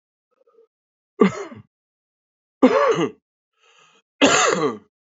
three_cough_length: 5.1 s
three_cough_amplitude: 29683
three_cough_signal_mean_std_ratio: 0.37
survey_phase: alpha (2021-03-01 to 2021-08-12)
age: 18-44
gender: Male
wearing_mask: 'No'
symptom_cough_any: true
symptom_new_continuous_cough: true
symptom_shortness_of_breath: true
symptom_abdominal_pain: true
symptom_fatigue: true
symptom_fever_high_temperature: true
symptom_headache: true
symptom_change_to_sense_of_smell_or_taste: true
symptom_loss_of_taste: true
symptom_onset: 3 days
smoker_status: Current smoker (1 to 10 cigarettes per day)
respiratory_condition_asthma: false
respiratory_condition_other: false
recruitment_source: Test and Trace
submission_delay: 2 days
covid_test_result: Positive
covid_test_method: RT-qPCR
covid_ct_value: 13.1
covid_ct_gene: ORF1ab gene
covid_ct_mean: 13.4
covid_viral_load: 41000000 copies/ml
covid_viral_load_category: High viral load (>1M copies/ml)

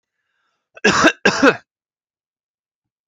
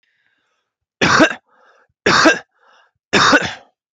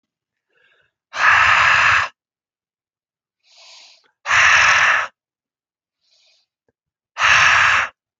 cough_length: 3.1 s
cough_amplitude: 31162
cough_signal_mean_std_ratio: 0.32
three_cough_length: 3.9 s
three_cough_amplitude: 29905
three_cough_signal_mean_std_ratio: 0.41
exhalation_length: 8.2 s
exhalation_amplitude: 29483
exhalation_signal_mean_std_ratio: 0.47
survey_phase: beta (2021-08-13 to 2022-03-07)
age: 18-44
gender: Male
wearing_mask: 'No'
symptom_none: true
smoker_status: Never smoked
respiratory_condition_asthma: false
respiratory_condition_other: false
recruitment_source: REACT
submission_delay: 4 days
covid_test_result: Negative
covid_test_method: RT-qPCR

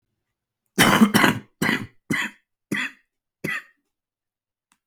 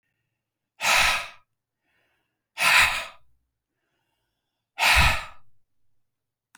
cough_length: 4.9 s
cough_amplitude: 32768
cough_signal_mean_std_ratio: 0.36
exhalation_length: 6.6 s
exhalation_amplitude: 21502
exhalation_signal_mean_std_ratio: 0.36
survey_phase: beta (2021-08-13 to 2022-03-07)
age: 45-64
gender: Male
wearing_mask: 'No'
symptom_cough_any: true
symptom_sore_throat: true
symptom_fatigue: true
symptom_onset: 5 days
smoker_status: Never smoked
respiratory_condition_asthma: false
respiratory_condition_other: false
recruitment_source: Test and Trace
submission_delay: 1 day
covid_test_result: Positive
covid_test_method: RT-qPCR
covid_ct_value: 14.3
covid_ct_gene: ORF1ab gene
covid_ct_mean: 14.5
covid_viral_load: 18000000 copies/ml
covid_viral_load_category: High viral load (>1M copies/ml)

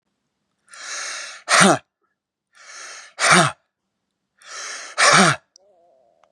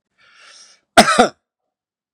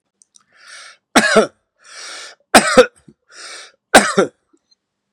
exhalation_length: 6.3 s
exhalation_amplitude: 32263
exhalation_signal_mean_std_ratio: 0.36
cough_length: 2.1 s
cough_amplitude: 32768
cough_signal_mean_std_ratio: 0.27
three_cough_length: 5.1 s
three_cough_amplitude: 32768
three_cough_signal_mean_std_ratio: 0.32
survey_phase: beta (2021-08-13 to 2022-03-07)
age: 65+
gender: Male
wearing_mask: 'No'
symptom_none: true
smoker_status: Current smoker (e-cigarettes or vapes only)
respiratory_condition_asthma: false
respiratory_condition_other: false
recruitment_source: REACT
submission_delay: 6 days
covid_test_result: Negative
covid_test_method: RT-qPCR
influenza_a_test_result: Negative
influenza_b_test_result: Negative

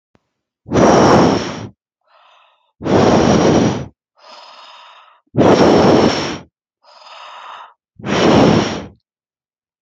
exhalation_length: 9.8 s
exhalation_amplitude: 31797
exhalation_signal_mean_std_ratio: 0.53
survey_phase: beta (2021-08-13 to 2022-03-07)
age: 18-44
gender: Female
wearing_mask: 'No'
symptom_none: true
smoker_status: Never smoked
respiratory_condition_asthma: false
respiratory_condition_other: false
recruitment_source: REACT
submission_delay: 1 day
covid_test_result: Negative
covid_test_method: RT-qPCR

